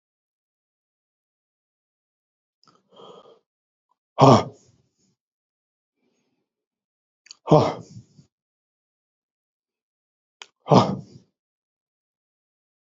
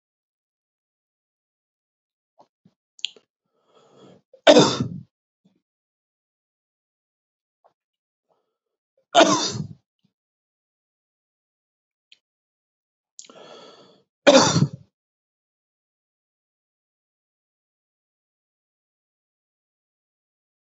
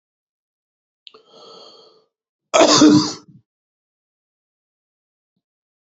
{
  "exhalation_length": "13.0 s",
  "exhalation_amplitude": 28946,
  "exhalation_signal_mean_std_ratio": 0.18,
  "three_cough_length": "20.7 s",
  "three_cough_amplitude": 32091,
  "three_cough_signal_mean_std_ratio": 0.17,
  "cough_length": "6.0 s",
  "cough_amplitude": 28804,
  "cough_signal_mean_std_ratio": 0.25,
  "survey_phase": "beta (2021-08-13 to 2022-03-07)",
  "age": "65+",
  "gender": "Male",
  "wearing_mask": "No",
  "symptom_none": true,
  "smoker_status": "Never smoked",
  "respiratory_condition_asthma": false,
  "respiratory_condition_other": false,
  "recruitment_source": "REACT",
  "submission_delay": "1 day",
  "covid_test_result": "Negative",
  "covid_test_method": "RT-qPCR"
}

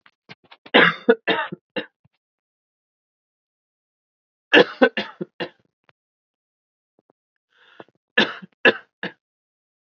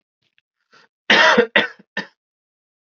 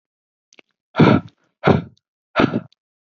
{
  "three_cough_length": "9.8 s",
  "three_cough_amplitude": 28489,
  "three_cough_signal_mean_std_ratio": 0.24,
  "cough_length": "3.0 s",
  "cough_amplitude": 29615,
  "cough_signal_mean_std_ratio": 0.33,
  "exhalation_length": "3.2 s",
  "exhalation_amplitude": 32767,
  "exhalation_signal_mean_std_ratio": 0.33,
  "survey_phase": "alpha (2021-03-01 to 2021-08-12)",
  "age": "18-44",
  "gender": "Male",
  "wearing_mask": "No",
  "symptom_none": true,
  "smoker_status": "Never smoked",
  "respiratory_condition_asthma": false,
  "respiratory_condition_other": false,
  "recruitment_source": "Test and Trace",
  "submission_delay": "2 days",
  "covid_test_result": "Positive",
  "covid_test_method": "RT-qPCR"
}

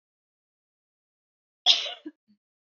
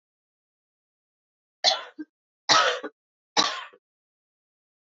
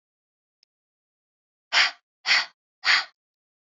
{
  "cough_length": "2.7 s",
  "cough_amplitude": 22825,
  "cough_signal_mean_std_ratio": 0.2,
  "three_cough_length": "4.9 s",
  "three_cough_amplitude": 24157,
  "three_cough_signal_mean_std_ratio": 0.28,
  "exhalation_length": "3.7 s",
  "exhalation_amplitude": 17310,
  "exhalation_signal_mean_std_ratio": 0.3,
  "survey_phase": "beta (2021-08-13 to 2022-03-07)",
  "age": "18-44",
  "gender": "Female",
  "wearing_mask": "No",
  "symptom_runny_or_blocked_nose": true,
  "symptom_sore_throat": true,
  "symptom_fatigue": true,
  "symptom_headache": true,
  "symptom_other": true,
  "symptom_onset": "3 days",
  "smoker_status": "Current smoker (11 or more cigarettes per day)",
  "respiratory_condition_asthma": false,
  "respiratory_condition_other": false,
  "recruitment_source": "Test and Trace",
  "submission_delay": "2 days",
  "covid_test_result": "Positive",
  "covid_test_method": "ePCR"
}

